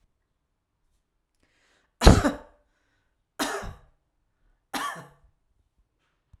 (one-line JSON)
{"three_cough_length": "6.4 s", "three_cough_amplitude": 32767, "three_cough_signal_mean_std_ratio": 0.19, "survey_phase": "alpha (2021-03-01 to 2021-08-12)", "age": "45-64", "gender": "Female", "wearing_mask": "No", "symptom_none": true, "smoker_status": "Ex-smoker", "respiratory_condition_asthma": true, "respiratory_condition_other": false, "recruitment_source": "REACT", "submission_delay": "5 days", "covid_test_result": "Negative", "covid_test_method": "RT-qPCR"}